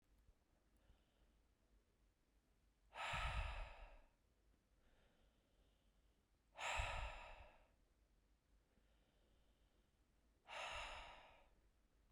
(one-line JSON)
{"exhalation_length": "12.1 s", "exhalation_amplitude": 884, "exhalation_signal_mean_std_ratio": 0.4, "survey_phase": "beta (2021-08-13 to 2022-03-07)", "age": "18-44", "gender": "Female", "wearing_mask": "No", "symptom_runny_or_blocked_nose": true, "symptom_fatigue": true, "symptom_headache": true, "symptom_other": true, "symptom_onset": "2 days", "smoker_status": "Never smoked", "respiratory_condition_asthma": false, "respiratory_condition_other": false, "recruitment_source": "Test and Trace", "submission_delay": "2 days", "covid_test_result": "Positive", "covid_test_method": "RT-qPCR", "covid_ct_value": 31.5, "covid_ct_gene": "N gene"}